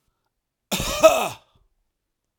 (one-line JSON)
{"cough_length": "2.4 s", "cough_amplitude": 32767, "cough_signal_mean_std_ratio": 0.31, "survey_phase": "beta (2021-08-13 to 2022-03-07)", "age": "45-64", "gender": "Male", "wearing_mask": "No", "symptom_none": true, "smoker_status": "Ex-smoker", "respiratory_condition_asthma": false, "respiratory_condition_other": false, "recruitment_source": "REACT", "submission_delay": "3 days", "covid_test_result": "Negative", "covid_test_method": "RT-qPCR", "influenza_a_test_result": "Negative", "influenza_b_test_result": "Negative"}